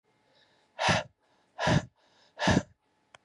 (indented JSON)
{
  "exhalation_length": "3.2 s",
  "exhalation_amplitude": 9031,
  "exhalation_signal_mean_std_ratio": 0.37,
  "survey_phase": "beta (2021-08-13 to 2022-03-07)",
  "age": "45-64",
  "gender": "Male",
  "wearing_mask": "No",
  "symptom_none": true,
  "smoker_status": "Never smoked",
  "respiratory_condition_asthma": false,
  "respiratory_condition_other": false,
  "recruitment_source": "REACT",
  "submission_delay": "1 day",
  "covid_test_result": "Negative",
  "covid_test_method": "RT-qPCR",
  "covid_ct_value": 38.0,
  "covid_ct_gene": "N gene",
  "influenza_a_test_result": "Negative",
  "influenza_b_test_result": "Negative"
}